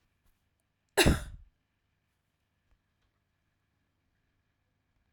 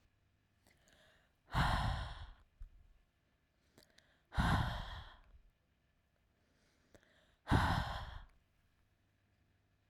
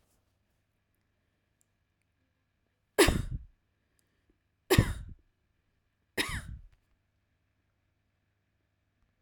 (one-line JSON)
{"cough_length": "5.1 s", "cough_amplitude": 12105, "cough_signal_mean_std_ratio": 0.17, "exhalation_length": "9.9 s", "exhalation_amplitude": 3979, "exhalation_signal_mean_std_ratio": 0.35, "three_cough_length": "9.2 s", "three_cough_amplitude": 12733, "three_cough_signal_mean_std_ratio": 0.21, "survey_phase": "alpha (2021-03-01 to 2021-08-12)", "age": "18-44", "gender": "Female", "wearing_mask": "No", "symptom_none": true, "smoker_status": "Never smoked", "respiratory_condition_asthma": false, "respiratory_condition_other": false, "recruitment_source": "REACT", "submission_delay": "1 day", "covid_test_result": "Negative", "covid_test_method": "RT-qPCR"}